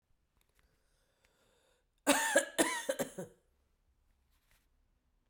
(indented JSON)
{
  "cough_length": "5.3 s",
  "cough_amplitude": 7374,
  "cough_signal_mean_std_ratio": 0.29,
  "survey_phase": "beta (2021-08-13 to 2022-03-07)",
  "age": "45-64",
  "gender": "Female",
  "wearing_mask": "No",
  "symptom_cough_any": true,
  "symptom_runny_or_blocked_nose": true,
  "symptom_shortness_of_breath": true,
  "symptom_fatigue": true,
  "symptom_headache": true,
  "symptom_change_to_sense_of_smell_or_taste": true,
  "symptom_onset": "5 days",
  "smoker_status": "Never smoked",
  "respiratory_condition_asthma": false,
  "respiratory_condition_other": false,
  "recruitment_source": "Test and Trace",
  "submission_delay": "2 days",
  "covid_test_result": "Positive",
  "covid_test_method": "RT-qPCR"
}